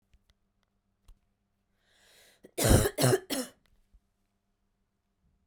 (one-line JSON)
{"three_cough_length": "5.5 s", "three_cough_amplitude": 12737, "three_cough_signal_mean_std_ratio": 0.27, "survey_phase": "beta (2021-08-13 to 2022-03-07)", "age": "18-44", "gender": "Female", "wearing_mask": "No", "symptom_cough_any": true, "symptom_new_continuous_cough": true, "symptom_runny_or_blocked_nose": true, "symptom_shortness_of_breath": true, "symptom_sore_throat": true, "symptom_fatigue": true, "symptom_headache": true, "symptom_change_to_sense_of_smell_or_taste": true, "symptom_onset": "3 days", "smoker_status": "Never smoked", "respiratory_condition_asthma": false, "respiratory_condition_other": false, "recruitment_source": "Test and Trace", "submission_delay": "2 days", "covid_test_result": "Positive", "covid_test_method": "RT-qPCR"}